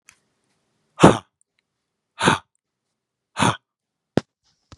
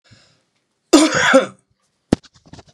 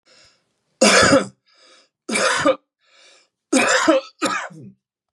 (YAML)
exhalation_length: 4.8 s
exhalation_amplitude: 32768
exhalation_signal_mean_std_ratio: 0.22
cough_length: 2.7 s
cough_amplitude: 32768
cough_signal_mean_std_ratio: 0.35
three_cough_length: 5.1 s
three_cough_amplitude: 31241
three_cough_signal_mean_std_ratio: 0.46
survey_phase: beta (2021-08-13 to 2022-03-07)
age: 45-64
gender: Male
wearing_mask: 'No'
symptom_none: true
symptom_onset: 12 days
smoker_status: Current smoker (1 to 10 cigarettes per day)
respiratory_condition_asthma: false
respiratory_condition_other: false
recruitment_source: REACT
submission_delay: 3 days
covid_test_result: Negative
covid_test_method: RT-qPCR
influenza_a_test_result: Negative
influenza_b_test_result: Negative